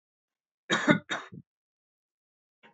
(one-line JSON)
{"cough_length": "2.7 s", "cough_amplitude": 13614, "cough_signal_mean_std_ratio": 0.26, "survey_phase": "beta (2021-08-13 to 2022-03-07)", "age": "18-44", "gender": "Male", "wearing_mask": "No", "symptom_cough_any": true, "symptom_sore_throat": true, "smoker_status": "Never smoked", "respiratory_condition_asthma": false, "respiratory_condition_other": false, "recruitment_source": "Test and Trace", "submission_delay": "2 days", "covid_test_result": "Positive", "covid_test_method": "RT-qPCR", "covid_ct_value": 14.8, "covid_ct_gene": "ORF1ab gene"}